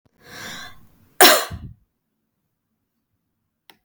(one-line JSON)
{"cough_length": "3.8 s", "cough_amplitude": 32768, "cough_signal_mean_std_ratio": 0.22, "survey_phase": "beta (2021-08-13 to 2022-03-07)", "age": "45-64", "gender": "Female", "wearing_mask": "No", "symptom_none": true, "smoker_status": "Never smoked", "respiratory_condition_asthma": false, "respiratory_condition_other": false, "recruitment_source": "REACT", "submission_delay": "2 days", "covid_test_result": "Negative", "covid_test_method": "RT-qPCR", "influenza_a_test_result": "Negative", "influenza_b_test_result": "Negative"}